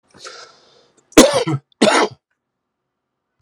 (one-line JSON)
{"cough_length": "3.4 s", "cough_amplitude": 32768, "cough_signal_mean_std_ratio": 0.32, "survey_phase": "alpha (2021-03-01 to 2021-08-12)", "age": "45-64", "gender": "Male", "wearing_mask": "No", "symptom_fatigue": true, "symptom_fever_high_temperature": true, "symptom_headache": true, "symptom_onset": "4 days", "smoker_status": "Never smoked", "respiratory_condition_asthma": false, "respiratory_condition_other": false, "recruitment_source": "Test and Trace", "submission_delay": "3 days", "covid_test_result": "Positive", "covid_test_method": "RT-qPCR", "covid_ct_value": 17.0, "covid_ct_gene": "ORF1ab gene", "covid_ct_mean": 17.8, "covid_viral_load": "1500000 copies/ml", "covid_viral_load_category": "High viral load (>1M copies/ml)"}